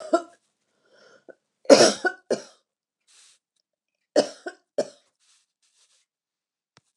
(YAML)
three_cough_length: 7.0 s
three_cough_amplitude: 29204
three_cough_signal_mean_std_ratio: 0.21
survey_phase: beta (2021-08-13 to 2022-03-07)
age: 65+
gender: Female
wearing_mask: 'No'
symptom_none: true
smoker_status: Never smoked
respiratory_condition_asthma: false
respiratory_condition_other: false
recruitment_source: REACT
submission_delay: 0 days
covid_test_result: Negative
covid_test_method: RT-qPCR